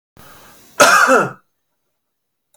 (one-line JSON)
{"cough_length": "2.6 s", "cough_amplitude": 32690, "cough_signal_mean_std_ratio": 0.37, "survey_phase": "beta (2021-08-13 to 2022-03-07)", "age": "45-64", "gender": "Male", "wearing_mask": "No", "symptom_runny_or_blocked_nose": true, "smoker_status": "Never smoked", "respiratory_condition_asthma": false, "respiratory_condition_other": false, "recruitment_source": "REACT", "submission_delay": "1 day", "covid_test_result": "Negative", "covid_test_method": "RT-qPCR"}